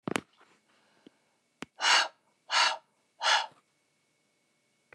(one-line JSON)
{"exhalation_length": "4.9 s", "exhalation_amplitude": 13820, "exhalation_signal_mean_std_ratio": 0.32, "survey_phase": "beta (2021-08-13 to 2022-03-07)", "age": "45-64", "gender": "Female", "wearing_mask": "No", "symptom_none": true, "smoker_status": "Never smoked", "respiratory_condition_asthma": false, "respiratory_condition_other": false, "recruitment_source": "REACT", "submission_delay": "3 days", "covid_test_result": "Negative", "covid_test_method": "RT-qPCR"}